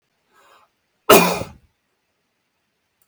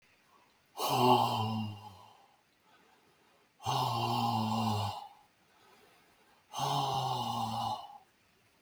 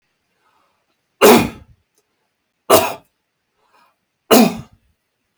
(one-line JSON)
{"cough_length": "3.1 s", "cough_amplitude": 32768, "cough_signal_mean_std_ratio": 0.23, "exhalation_length": "8.6 s", "exhalation_amplitude": 7524, "exhalation_signal_mean_std_ratio": 0.57, "three_cough_length": "5.4 s", "three_cough_amplitude": 32768, "three_cough_signal_mean_std_ratio": 0.29, "survey_phase": "beta (2021-08-13 to 2022-03-07)", "age": "65+", "gender": "Male", "wearing_mask": "No", "symptom_none": true, "smoker_status": "Never smoked", "respiratory_condition_asthma": false, "respiratory_condition_other": false, "recruitment_source": "REACT", "submission_delay": "2 days", "covid_test_result": "Negative", "covid_test_method": "RT-qPCR", "influenza_a_test_result": "Negative", "influenza_b_test_result": "Negative"}